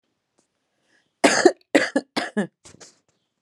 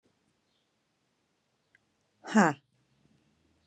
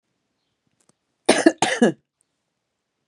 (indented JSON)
{
  "three_cough_length": "3.4 s",
  "three_cough_amplitude": 31367,
  "three_cough_signal_mean_std_ratio": 0.3,
  "exhalation_length": "3.7 s",
  "exhalation_amplitude": 12432,
  "exhalation_signal_mean_std_ratio": 0.17,
  "cough_length": "3.1 s",
  "cough_amplitude": 31703,
  "cough_signal_mean_std_ratio": 0.26,
  "survey_phase": "alpha (2021-03-01 to 2021-08-12)",
  "age": "45-64",
  "gender": "Female",
  "wearing_mask": "No",
  "symptom_none": true,
  "symptom_onset": "9 days",
  "smoker_status": "Current smoker (11 or more cigarettes per day)",
  "respiratory_condition_asthma": false,
  "respiratory_condition_other": false,
  "recruitment_source": "REACT",
  "submission_delay": "2 days",
  "covid_test_result": "Negative",
  "covid_test_method": "RT-qPCR"
}